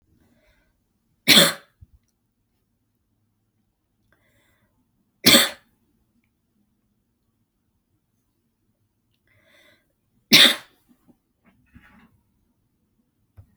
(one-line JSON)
{"three_cough_length": "13.6 s", "three_cough_amplitude": 32768, "three_cough_signal_mean_std_ratio": 0.18, "survey_phase": "beta (2021-08-13 to 2022-03-07)", "age": "18-44", "gender": "Female", "wearing_mask": "No", "symptom_none": true, "symptom_onset": "8 days", "smoker_status": "Never smoked", "respiratory_condition_asthma": false, "respiratory_condition_other": false, "recruitment_source": "REACT", "submission_delay": "6 days", "covid_test_result": "Negative", "covid_test_method": "RT-qPCR"}